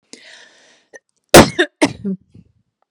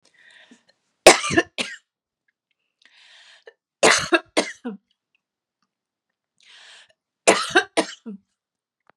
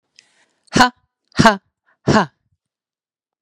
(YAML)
cough_length: 2.9 s
cough_amplitude: 32768
cough_signal_mean_std_ratio: 0.26
three_cough_length: 9.0 s
three_cough_amplitude: 32768
three_cough_signal_mean_std_ratio: 0.25
exhalation_length: 3.4 s
exhalation_amplitude: 32768
exhalation_signal_mean_std_ratio: 0.28
survey_phase: beta (2021-08-13 to 2022-03-07)
age: 45-64
gender: Female
wearing_mask: 'No'
symptom_sore_throat: true
smoker_status: Never smoked
respiratory_condition_asthma: true
respiratory_condition_other: false
recruitment_source: Test and Trace
submission_delay: 1 day
covid_test_result: Negative
covid_test_method: RT-qPCR